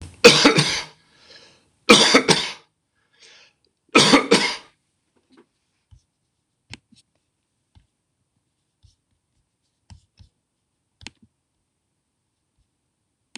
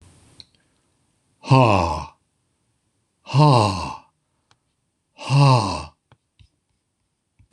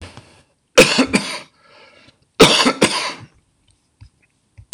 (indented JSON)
{
  "three_cough_length": "13.4 s",
  "three_cough_amplitude": 26028,
  "three_cough_signal_mean_std_ratio": 0.25,
  "exhalation_length": "7.5 s",
  "exhalation_amplitude": 25841,
  "exhalation_signal_mean_std_ratio": 0.36,
  "cough_length": "4.7 s",
  "cough_amplitude": 26028,
  "cough_signal_mean_std_ratio": 0.36,
  "survey_phase": "beta (2021-08-13 to 2022-03-07)",
  "age": "65+",
  "gender": "Male",
  "wearing_mask": "No",
  "symptom_none": true,
  "smoker_status": "Never smoked",
  "respiratory_condition_asthma": false,
  "respiratory_condition_other": false,
  "recruitment_source": "REACT",
  "submission_delay": "1 day",
  "covid_test_result": "Negative",
  "covid_test_method": "RT-qPCR",
  "influenza_a_test_result": "Negative",
  "influenza_b_test_result": "Negative"
}